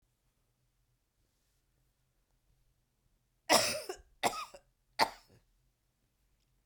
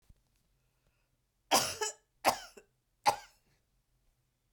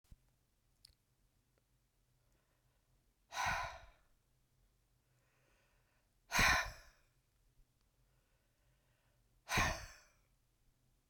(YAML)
cough_length: 6.7 s
cough_amplitude: 12587
cough_signal_mean_std_ratio: 0.22
three_cough_length: 4.5 s
three_cough_amplitude: 7540
three_cough_signal_mean_std_ratio: 0.25
exhalation_length: 11.1 s
exhalation_amplitude: 3760
exhalation_signal_mean_std_ratio: 0.25
survey_phase: beta (2021-08-13 to 2022-03-07)
age: 45-64
gender: Female
wearing_mask: 'No'
symptom_none: true
smoker_status: Never smoked
respiratory_condition_asthma: false
respiratory_condition_other: false
recruitment_source: REACT
submission_delay: 0 days
covid_test_result: Negative
covid_test_method: RT-qPCR